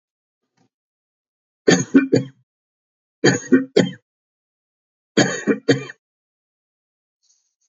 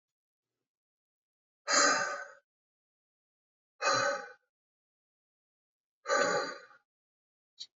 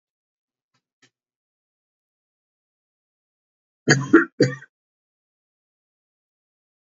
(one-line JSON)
{"three_cough_length": "7.7 s", "three_cough_amplitude": 32005, "three_cough_signal_mean_std_ratio": 0.3, "exhalation_length": "7.8 s", "exhalation_amplitude": 6711, "exhalation_signal_mean_std_ratio": 0.34, "cough_length": "6.9 s", "cough_amplitude": 30382, "cough_signal_mean_std_ratio": 0.17, "survey_phase": "beta (2021-08-13 to 2022-03-07)", "age": "65+", "gender": "Male", "wearing_mask": "No", "symptom_none": true, "smoker_status": "Never smoked", "respiratory_condition_asthma": false, "respiratory_condition_other": false, "recruitment_source": "REACT", "submission_delay": "0 days", "covid_test_result": "Negative", "covid_test_method": "RT-qPCR", "influenza_a_test_result": "Negative", "influenza_b_test_result": "Negative"}